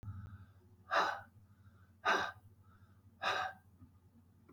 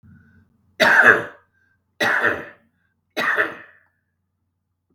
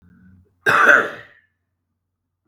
{"exhalation_length": "4.5 s", "exhalation_amplitude": 3724, "exhalation_signal_mean_std_ratio": 0.41, "three_cough_length": "4.9 s", "three_cough_amplitude": 32768, "three_cough_signal_mean_std_ratio": 0.37, "cough_length": "2.5 s", "cough_amplitude": 32768, "cough_signal_mean_std_ratio": 0.34, "survey_phase": "beta (2021-08-13 to 2022-03-07)", "age": "45-64", "gender": "Male", "wearing_mask": "No", "symptom_cough_any": true, "symptom_sore_throat": true, "smoker_status": "Ex-smoker", "respiratory_condition_asthma": false, "respiratory_condition_other": true, "recruitment_source": "Test and Trace", "submission_delay": "2 days", "covid_test_result": "Positive", "covid_test_method": "RT-qPCR", "covid_ct_value": 24.7, "covid_ct_gene": "ORF1ab gene", "covid_ct_mean": 24.7, "covid_viral_load": "7900 copies/ml", "covid_viral_load_category": "Minimal viral load (< 10K copies/ml)"}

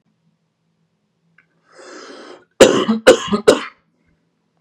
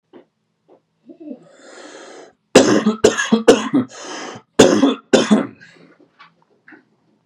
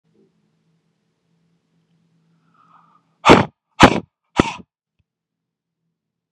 {"cough_length": "4.6 s", "cough_amplitude": 32768, "cough_signal_mean_std_ratio": 0.29, "three_cough_length": "7.3 s", "three_cough_amplitude": 32768, "three_cough_signal_mean_std_ratio": 0.38, "exhalation_length": "6.3 s", "exhalation_amplitude": 32768, "exhalation_signal_mean_std_ratio": 0.19, "survey_phase": "beta (2021-08-13 to 2022-03-07)", "age": "18-44", "gender": "Male", "wearing_mask": "No", "symptom_none": true, "smoker_status": "Never smoked", "respiratory_condition_asthma": false, "respiratory_condition_other": false, "recruitment_source": "REACT", "submission_delay": "1 day", "covid_test_result": "Negative", "covid_test_method": "RT-qPCR", "influenza_a_test_result": "Negative", "influenza_b_test_result": "Negative"}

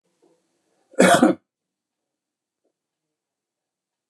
{"cough_length": "4.1 s", "cough_amplitude": 29024, "cough_signal_mean_std_ratio": 0.22, "survey_phase": "beta (2021-08-13 to 2022-03-07)", "age": "65+", "gender": "Male", "wearing_mask": "No", "symptom_none": true, "symptom_onset": "12 days", "smoker_status": "Ex-smoker", "respiratory_condition_asthma": false, "respiratory_condition_other": false, "recruitment_source": "REACT", "submission_delay": "2 days", "covid_test_result": "Negative", "covid_test_method": "RT-qPCR", "influenza_a_test_result": "Negative", "influenza_b_test_result": "Negative"}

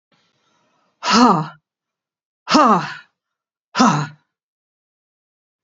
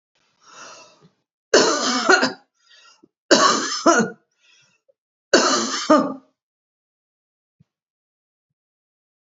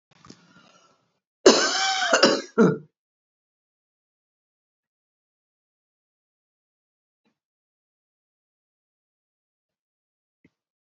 {"exhalation_length": "5.6 s", "exhalation_amplitude": 29042, "exhalation_signal_mean_std_ratio": 0.35, "three_cough_length": "9.2 s", "three_cough_amplitude": 32103, "three_cough_signal_mean_std_ratio": 0.37, "cough_length": "10.8 s", "cough_amplitude": 32283, "cough_signal_mean_std_ratio": 0.22, "survey_phase": "beta (2021-08-13 to 2022-03-07)", "age": "65+", "gender": "Female", "wearing_mask": "No", "symptom_none": true, "smoker_status": "Ex-smoker", "respiratory_condition_asthma": false, "respiratory_condition_other": false, "recruitment_source": "REACT", "submission_delay": "1 day", "covid_test_result": "Negative", "covid_test_method": "RT-qPCR", "influenza_a_test_result": "Negative", "influenza_b_test_result": "Negative"}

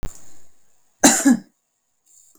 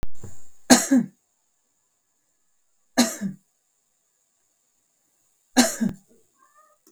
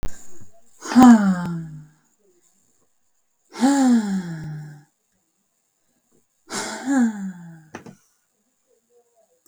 {"cough_length": "2.4 s", "cough_amplitude": 32768, "cough_signal_mean_std_ratio": 0.36, "three_cough_length": "6.9 s", "three_cough_amplitude": 32768, "three_cough_signal_mean_std_ratio": 0.32, "exhalation_length": "9.5 s", "exhalation_amplitude": 30816, "exhalation_signal_mean_std_ratio": 0.38, "survey_phase": "beta (2021-08-13 to 2022-03-07)", "age": "18-44", "gender": "Female", "wearing_mask": "No", "symptom_none": true, "smoker_status": "Ex-smoker", "respiratory_condition_asthma": true, "respiratory_condition_other": false, "recruitment_source": "REACT", "submission_delay": "1 day", "covid_test_result": "Negative", "covid_test_method": "RT-qPCR"}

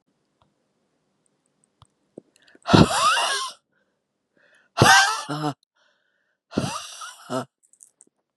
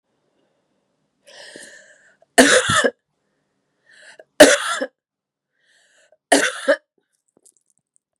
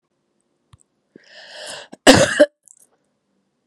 {"exhalation_length": "8.4 s", "exhalation_amplitude": 31670, "exhalation_signal_mean_std_ratio": 0.32, "three_cough_length": "8.2 s", "three_cough_amplitude": 32768, "three_cough_signal_mean_std_ratio": 0.27, "cough_length": "3.7 s", "cough_amplitude": 32768, "cough_signal_mean_std_ratio": 0.25, "survey_phase": "beta (2021-08-13 to 2022-03-07)", "age": "45-64", "gender": "Female", "wearing_mask": "No", "symptom_cough_any": true, "symptom_runny_or_blocked_nose": true, "symptom_fatigue": true, "symptom_headache": true, "symptom_onset": "3 days", "smoker_status": "Never smoked", "respiratory_condition_asthma": true, "respiratory_condition_other": false, "recruitment_source": "Test and Trace", "submission_delay": "1 day", "covid_test_result": "Positive", "covid_test_method": "RT-qPCR", "covid_ct_value": 18.9, "covid_ct_gene": "N gene", "covid_ct_mean": 19.7, "covid_viral_load": "350000 copies/ml", "covid_viral_load_category": "Low viral load (10K-1M copies/ml)"}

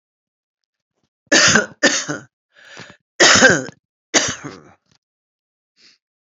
{"cough_length": "6.2 s", "cough_amplitude": 32768, "cough_signal_mean_std_ratio": 0.35, "survey_phase": "beta (2021-08-13 to 2022-03-07)", "age": "65+", "gender": "Female", "wearing_mask": "No", "symptom_cough_any": true, "symptom_runny_or_blocked_nose": true, "smoker_status": "Current smoker (e-cigarettes or vapes only)", "respiratory_condition_asthma": false, "respiratory_condition_other": false, "recruitment_source": "Test and Trace", "submission_delay": "1 day", "covid_test_result": "Positive", "covid_test_method": "LFT"}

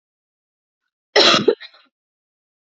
{"cough_length": "2.7 s", "cough_amplitude": 32767, "cough_signal_mean_std_ratio": 0.28, "survey_phase": "beta (2021-08-13 to 2022-03-07)", "age": "18-44", "gender": "Female", "wearing_mask": "No", "symptom_sore_throat": true, "symptom_headache": true, "symptom_onset": "2 days", "smoker_status": "Never smoked", "respiratory_condition_asthma": false, "respiratory_condition_other": false, "recruitment_source": "Test and Trace", "submission_delay": "1 day", "covid_test_result": "Negative", "covid_test_method": "ePCR"}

